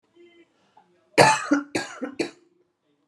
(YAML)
cough_length: 3.1 s
cough_amplitude: 29470
cough_signal_mean_std_ratio: 0.32
survey_phase: alpha (2021-03-01 to 2021-08-12)
age: 18-44
gender: Female
wearing_mask: 'No'
symptom_headache: true
smoker_status: Ex-smoker
respiratory_condition_asthma: false
respiratory_condition_other: false
recruitment_source: Test and Trace
submission_delay: 2 days
covid_test_result: Positive
covid_test_method: RT-qPCR
covid_ct_value: 27.4
covid_ct_gene: N gene
covid_ct_mean: 27.7
covid_viral_load: 830 copies/ml
covid_viral_load_category: Minimal viral load (< 10K copies/ml)